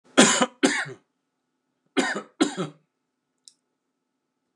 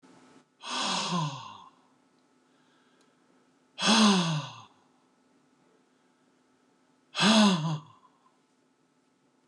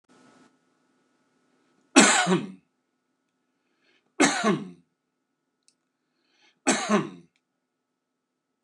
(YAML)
cough_length: 4.6 s
cough_amplitude: 29075
cough_signal_mean_std_ratio: 0.32
exhalation_length: 9.5 s
exhalation_amplitude: 11102
exhalation_signal_mean_std_ratio: 0.36
three_cough_length: 8.6 s
three_cough_amplitude: 28231
three_cough_signal_mean_std_ratio: 0.28
survey_phase: beta (2021-08-13 to 2022-03-07)
age: 65+
gender: Male
wearing_mask: 'No'
symptom_none: true
smoker_status: Never smoked
respiratory_condition_asthma: false
respiratory_condition_other: false
recruitment_source: REACT
submission_delay: 2 days
covid_test_result: Negative
covid_test_method: RT-qPCR
covid_ct_value: 38.3
covid_ct_gene: N gene
influenza_a_test_result: Negative
influenza_b_test_result: Negative